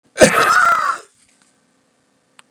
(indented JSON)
{
  "cough_length": "2.5 s",
  "cough_amplitude": 32768,
  "cough_signal_mean_std_ratio": 0.43,
  "survey_phase": "beta (2021-08-13 to 2022-03-07)",
  "age": "45-64",
  "gender": "Male",
  "wearing_mask": "No",
  "symptom_runny_or_blocked_nose": true,
  "symptom_change_to_sense_of_smell_or_taste": true,
  "symptom_loss_of_taste": true,
  "smoker_status": "Never smoked",
  "respiratory_condition_asthma": false,
  "respiratory_condition_other": false,
  "recruitment_source": "Test and Trace",
  "submission_delay": "1 day",
  "covid_test_result": "Positive",
  "covid_test_method": "RT-qPCR",
  "covid_ct_value": 15.2,
  "covid_ct_gene": "ORF1ab gene",
  "covid_ct_mean": 15.8,
  "covid_viral_load": "6600000 copies/ml",
  "covid_viral_load_category": "High viral load (>1M copies/ml)"
}